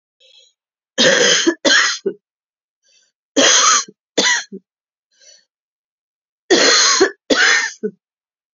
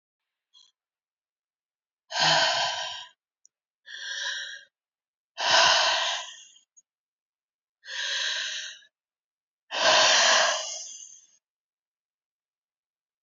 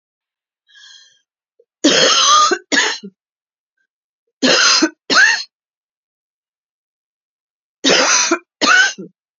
cough_length: 8.5 s
cough_amplitude: 32768
cough_signal_mean_std_ratio: 0.48
exhalation_length: 13.2 s
exhalation_amplitude: 15716
exhalation_signal_mean_std_ratio: 0.42
three_cough_length: 9.4 s
three_cough_amplitude: 32768
three_cough_signal_mean_std_ratio: 0.45
survey_phase: beta (2021-08-13 to 2022-03-07)
age: 45-64
gender: Female
wearing_mask: 'No'
symptom_cough_any: true
symptom_runny_or_blocked_nose: true
symptom_sore_throat: true
symptom_fatigue: true
symptom_headache: true
symptom_onset: 1 day
smoker_status: Never smoked
respiratory_condition_asthma: false
respiratory_condition_other: false
recruitment_source: Test and Trace
submission_delay: 1 day
covid_test_result: Negative
covid_test_method: RT-qPCR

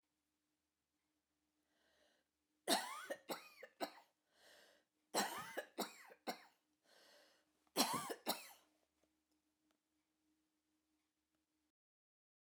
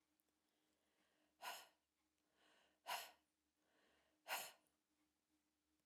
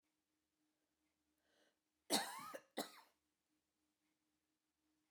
three_cough_length: 12.5 s
three_cough_amplitude: 3138
three_cough_signal_mean_std_ratio: 0.28
exhalation_length: 5.9 s
exhalation_amplitude: 735
exhalation_signal_mean_std_ratio: 0.28
cough_length: 5.1 s
cough_amplitude: 2133
cough_signal_mean_std_ratio: 0.22
survey_phase: beta (2021-08-13 to 2022-03-07)
age: 45-64
gender: Female
wearing_mask: 'No'
symptom_none: true
smoker_status: Never smoked
respiratory_condition_asthma: false
respiratory_condition_other: false
recruitment_source: REACT
submission_delay: 2 days
covid_test_result: Negative
covid_test_method: RT-qPCR
influenza_a_test_result: Negative
influenza_b_test_result: Negative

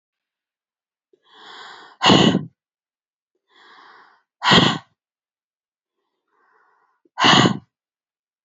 exhalation_length: 8.4 s
exhalation_amplitude: 31729
exhalation_signal_mean_std_ratio: 0.29
survey_phase: beta (2021-08-13 to 2022-03-07)
age: 18-44
gender: Female
wearing_mask: 'No'
symptom_none: true
smoker_status: Never smoked
respiratory_condition_asthma: false
respiratory_condition_other: false
recruitment_source: REACT
submission_delay: 2 days
covid_test_result: Negative
covid_test_method: RT-qPCR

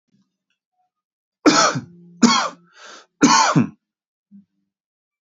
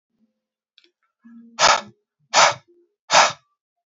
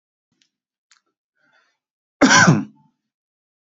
three_cough_length: 5.4 s
three_cough_amplitude: 28796
three_cough_signal_mean_std_ratio: 0.35
exhalation_length: 3.9 s
exhalation_amplitude: 28743
exhalation_signal_mean_std_ratio: 0.31
cough_length: 3.7 s
cough_amplitude: 32625
cough_signal_mean_std_ratio: 0.27
survey_phase: beta (2021-08-13 to 2022-03-07)
age: 45-64
gender: Male
wearing_mask: 'No'
symptom_none: true
smoker_status: Ex-smoker
respiratory_condition_asthma: false
respiratory_condition_other: false
recruitment_source: REACT
submission_delay: 1 day
covid_test_result: Negative
covid_test_method: RT-qPCR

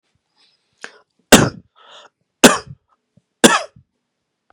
three_cough_length: 4.5 s
three_cough_amplitude: 32768
three_cough_signal_mean_std_ratio: 0.23
survey_phase: beta (2021-08-13 to 2022-03-07)
age: 45-64
gender: Male
wearing_mask: 'No'
symptom_cough_any: true
symptom_onset: 7 days
smoker_status: Ex-smoker
respiratory_condition_asthma: false
respiratory_condition_other: false
recruitment_source: REACT
submission_delay: 2 days
covid_test_result: Negative
covid_test_method: RT-qPCR
influenza_a_test_result: Negative
influenza_b_test_result: Negative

